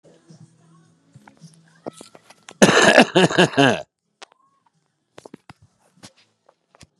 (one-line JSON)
{"cough_length": "7.0 s", "cough_amplitude": 32768, "cough_signal_mean_std_ratio": 0.28, "survey_phase": "beta (2021-08-13 to 2022-03-07)", "age": "65+", "gender": "Male", "wearing_mask": "No", "symptom_none": true, "smoker_status": "Current smoker (11 or more cigarettes per day)", "respiratory_condition_asthma": false, "respiratory_condition_other": false, "recruitment_source": "REACT", "submission_delay": "3 days", "covid_test_result": "Negative", "covid_test_method": "RT-qPCR", "influenza_a_test_result": "Negative", "influenza_b_test_result": "Negative"}